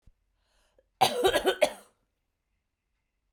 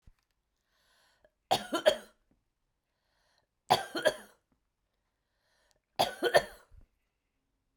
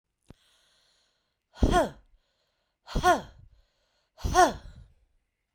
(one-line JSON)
{"cough_length": "3.3 s", "cough_amplitude": 14397, "cough_signal_mean_std_ratio": 0.31, "three_cough_length": "7.8 s", "three_cough_amplitude": 10772, "three_cough_signal_mean_std_ratio": 0.24, "exhalation_length": "5.5 s", "exhalation_amplitude": 13441, "exhalation_signal_mean_std_ratio": 0.3, "survey_phase": "beta (2021-08-13 to 2022-03-07)", "age": "45-64", "gender": "Female", "wearing_mask": "No", "symptom_none": true, "smoker_status": "Never smoked", "respiratory_condition_asthma": false, "respiratory_condition_other": false, "recruitment_source": "REACT", "submission_delay": "2 days", "covid_test_result": "Negative", "covid_test_method": "RT-qPCR"}